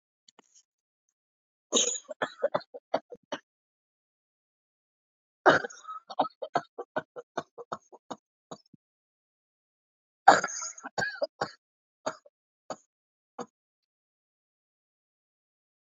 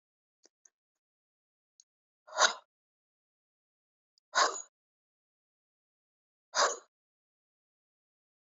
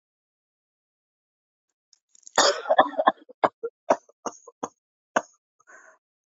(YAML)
three_cough_length: 16.0 s
three_cough_amplitude: 25874
three_cough_signal_mean_std_ratio: 0.21
exhalation_length: 8.5 s
exhalation_amplitude: 12504
exhalation_signal_mean_std_ratio: 0.19
cough_length: 6.4 s
cough_amplitude: 24432
cough_signal_mean_std_ratio: 0.24
survey_phase: beta (2021-08-13 to 2022-03-07)
age: 65+
gender: Female
wearing_mask: 'No'
symptom_cough_any: true
symptom_fatigue: true
symptom_onset: 7 days
smoker_status: Never smoked
respiratory_condition_asthma: true
respiratory_condition_other: false
recruitment_source: Test and Trace
submission_delay: 2 days
covid_test_result: Positive
covid_test_method: RT-qPCR
covid_ct_value: 30.1
covid_ct_gene: ORF1ab gene